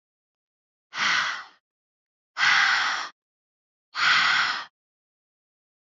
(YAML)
exhalation_length: 5.9 s
exhalation_amplitude: 12954
exhalation_signal_mean_std_ratio: 0.46
survey_phase: alpha (2021-03-01 to 2021-08-12)
age: 18-44
gender: Female
wearing_mask: 'No'
symptom_none: true
smoker_status: Never smoked
respiratory_condition_asthma: false
respiratory_condition_other: false
recruitment_source: REACT
submission_delay: 1 day
covid_test_result: Negative
covid_test_method: RT-qPCR